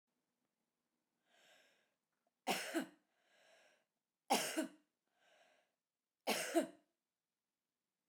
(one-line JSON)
{"three_cough_length": "8.1 s", "three_cough_amplitude": 2783, "three_cough_signal_mean_std_ratio": 0.28, "survey_phase": "beta (2021-08-13 to 2022-03-07)", "age": "45-64", "gender": "Female", "wearing_mask": "No", "symptom_none": true, "smoker_status": "Never smoked", "respiratory_condition_asthma": false, "respiratory_condition_other": false, "recruitment_source": "REACT", "submission_delay": "8 days", "covid_test_result": "Negative", "covid_test_method": "RT-qPCR"}